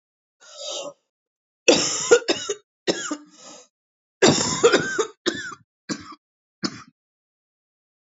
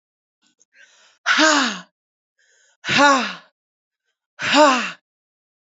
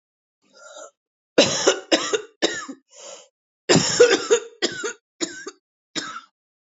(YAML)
three_cough_length: 8.0 s
three_cough_amplitude: 26725
three_cough_signal_mean_std_ratio: 0.37
exhalation_length: 5.7 s
exhalation_amplitude: 29006
exhalation_signal_mean_std_ratio: 0.39
cough_length: 6.7 s
cough_amplitude: 27008
cough_signal_mean_std_ratio: 0.39
survey_phase: alpha (2021-03-01 to 2021-08-12)
age: 45-64
gender: Female
wearing_mask: 'No'
symptom_cough_any: true
symptom_shortness_of_breath: true
symptom_headache: true
symptom_onset: 6 days
smoker_status: Ex-smoker
respiratory_condition_asthma: false
respiratory_condition_other: false
recruitment_source: Test and Trace
submission_delay: 1 day
covid_test_result: Positive
covid_test_method: RT-qPCR